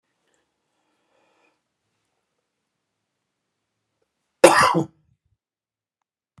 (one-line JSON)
{"cough_length": "6.4 s", "cough_amplitude": 32768, "cough_signal_mean_std_ratio": 0.17, "survey_phase": "beta (2021-08-13 to 2022-03-07)", "age": "65+", "gender": "Male", "wearing_mask": "No", "symptom_none": true, "symptom_onset": "2 days", "smoker_status": "Never smoked", "respiratory_condition_asthma": false, "respiratory_condition_other": false, "recruitment_source": "REACT", "submission_delay": "1 day", "covid_test_result": "Negative", "covid_test_method": "RT-qPCR"}